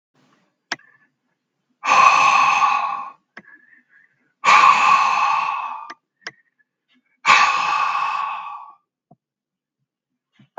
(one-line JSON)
{"exhalation_length": "10.6 s", "exhalation_amplitude": 32768, "exhalation_signal_mean_std_ratio": 0.48, "survey_phase": "beta (2021-08-13 to 2022-03-07)", "age": "45-64", "gender": "Male", "wearing_mask": "No", "symptom_none": true, "smoker_status": "Ex-smoker", "respiratory_condition_asthma": false, "respiratory_condition_other": false, "recruitment_source": "REACT", "submission_delay": "1 day", "covid_test_result": "Negative", "covid_test_method": "RT-qPCR"}